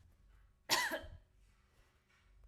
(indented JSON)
{
  "cough_length": "2.5 s",
  "cough_amplitude": 6363,
  "cough_signal_mean_std_ratio": 0.33,
  "survey_phase": "alpha (2021-03-01 to 2021-08-12)",
  "age": "18-44",
  "gender": "Female",
  "wearing_mask": "No",
  "symptom_none": true,
  "smoker_status": "Never smoked",
  "respiratory_condition_asthma": false,
  "respiratory_condition_other": false,
  "recruitment_source": "REACT",
  "submission_delay": "2 days",
  "covid_test_result": "Negative",
  "covid_test_method": "RT-qPCR"
}